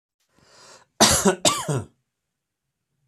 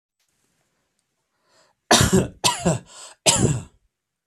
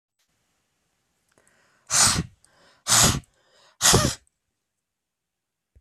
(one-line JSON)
{"cough_length": "3.1 s", "cough_amplitude": 28538, "cough_signal_mean_std_ratio": 0.35, "three_cough_length": "4.3 s", "three_cough_amplitude": 30065, "three_cough_signal_mean_std_ratio": 0.37, "exhalation_length": "5.8 s", "exhalation_amplitude": 23718, "exhalation_signal_mean_std_ratio": 0.32, "survey_phase": "beta (2021-08-13 to 2022-03-07)", "age": "45-64", "gender": "Male", "wearing_mask": "No", "symptom_none": true, "smoker_status": "Ex-smoker", "respiratory_condition_asthma": false, "respiratory_condition_other": false, "recruitment_source": "REACT", "submission_delay": "1 day", "covid_test_result": "Negative", "covid_test_method": "RT-qPCR"}